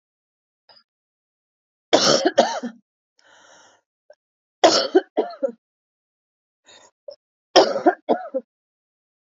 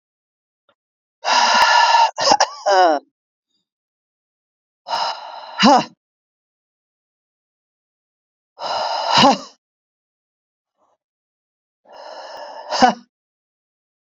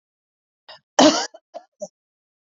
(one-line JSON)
{"three_cough_length": "9.2 s", "three_cough_amplitude": 30223, "three_cough_signal_mean_std_ratio": 0.3, "exhalation_length": "14.2 s", "exhalation_amplitude": 31725, "exhalation_signal_mean_std_ratio": 0.36, "cough_length": "2.6 s", "cough_amplitude": 28391, "cough_signal_mean_std_ratio": 0.24, "survey_phase": "beta (2021-08-13 to 2022-03-07)", "age": "45-64", "gender": "Female", "wearing_mask": "No", "symptom_cough_any": true, "symptom_runny_or_blocked_nose": true, "symptom_sore_throat": true, "smoker_status": "Never smoked", "respiratory_condition_asthma": false, "respiratory_condition_other": false, "recruitment_source": "Test and Trace", "submission_delay": "194 days", "covid_test_result": "Negative", "covid_test_method": "LFT"}